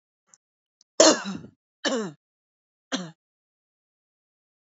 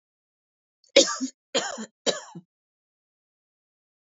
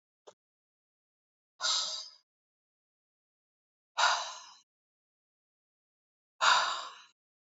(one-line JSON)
{"three_cough_length": "4.6 s", "three_cough_amplitude": 26293, "three_cough_signal_mean_std_ratio": 0.24, "cough_length": "4.1 s", "cough_amplitude": 26463, "cough_signal_mean_std_ratio": 0.24, "exhalation_length": "7.5 s", "exhalation_amplitude": 9965, "exhalation_signal_mean_std_ratio": 0.29, "survey_phase": "alpha (2021-03-01 to 2021-08-12)", "age": "18-44", "gender": "Female", "wearing_mask": "No", "symptom_none": true, "smoker_status": "Never smoked", "respiratory_condition_asthma": false, "respiratory_condition_other": false, "recruitment_source": "REACT", "submission_delay": "2 days", "covid_test_result": "Negative", "covid_test_method": "RT-qPCR"}